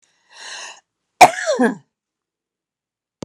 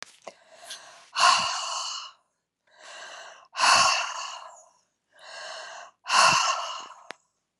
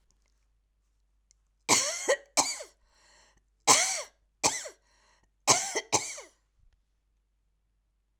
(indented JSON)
{
  "cough_length": "3.2 s",
  "cough_amplitude": 32768,
  "cough_signal_mean_std_ratio": 0.25,
  "exhalation_length": "7.6 s",
  "exhalation_amplitude": 16376,
  "exhalation_signal_mean_std_ratio": 0.44,
  "three_cough_length": "8.2 s",
  "three_cough_amplitude": 17600,
  "three_cough_signal_mean_std_ratio": 0.32,
  "survey_phase": "alpha (2021-03-01 to 2021-08-12)",
  "age": "65+",
  "gender": "Female",
  "wearing_mask": "No",
  "symptom_none": true,
  "smoker_status": "Ex-smoker",
  "respiratory_condition_asthma": false,
  "respiratory_condition_other": false,
  "recruitment_source": "REACT",
  "submission_delay": "1 day",
  "covid_test_result": "Negative",
  "covid_test_method": "RT-qPCR"
}